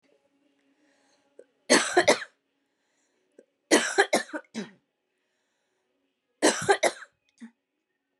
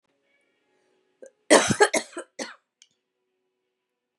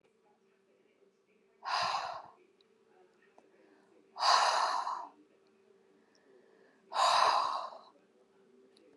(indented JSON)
{
  "three_cough_length": "8.2 s",
  "three_cough_amplitude": 18653,
  "three_cough_signal_mean_std_ratio": 0.29,
  "cough_length": "4.2 s",
  "cough_amplitude": 29384,
  "cough_signal_mean_std_ratio": 0.24,
  "exhalation_length": "9.0 s",
  "exhalation_amplitude": 8867,
  "exhalation_signal_mean_std_ratio": 0.39,
  "survey_phase": "beta (2021-08-13 to 2022-03-07)",
  "age": "45-64",
  "gender": "Female",
  "wearing_mask": "No",
  "symptom_cough_any": true,
  "symptom_runny_or_blocked_nose": true,
  "symptom_sore_throat": true,
  "symptom_fatigue": true,
  "symptom_headache": true,
  "symptom_other": true,
  "symptom_onset": "1 day",
  "smoker_status": "Never smoked",
  "respiratory_condition_asthma": false,
  "respiratory_condition_other": false,
  "recruitment_source": "Test and Trace",
  "submission_delay": "0 days",
  "covid_test_result": "Positive",
  "covid_test_method": "RT-qPCR",
  "covid_ct_value": 31.5,
  "covid_ct_gene": "N gene"
}